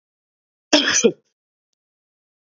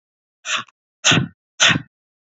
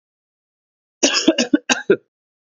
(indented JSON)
{
  "cough_length": "2.6 s",
  "cough_amplitude": 29579,
  "cough_signal_mean_std_ratio": 0.28,
  "exhalation_length": "2.2 s",
  "exhalation_amplitude": 32266,
  "exhalation_signal_mean_std_ratio": 0.38,
  "three_cough_length": "2.5 s",
  "three_cough_amplitude": 28566,
  "three_cough_signal_mean_std_ratio": 0.35,
  "survey_phase": "beta (2021-08-13 to 2022-03-07)",
  "age": "18-44",
  "gender": "Male",
  "wearing_mask": "No",
  "symptom_cough_any": true,
  "symptom_new_continuous_cough": true,
  "symptom_runny_or_blocked_nose": true,
  "symptom_shortness_of_breath": true,
  "symptom_sore_throat": true,
  "symptom_fatigue": true,
  "symptom_headache": true,
  "symptom_onset": "3 days",
  "smoker_status": "Never smoked",
  "respiratory_condition_asthma": false,
  "respiratory_condition_other": false,
  "recruitment_source": "Test and Trace",
  "submission_delay": "2 days",
  "covid_test_result": "Positive",
  "covid_test_method": "RT-qPCR",
  "covid_ct_value": 23.3,
  "covid_ct_gene": "ORF1ab gene",
  "covid_ct_mean": 23.8,
  "covid_viral_load": "15000 copies/ml",
  "covid_viral_load_category": "Low viral load (10K-1M copies/ml)"
}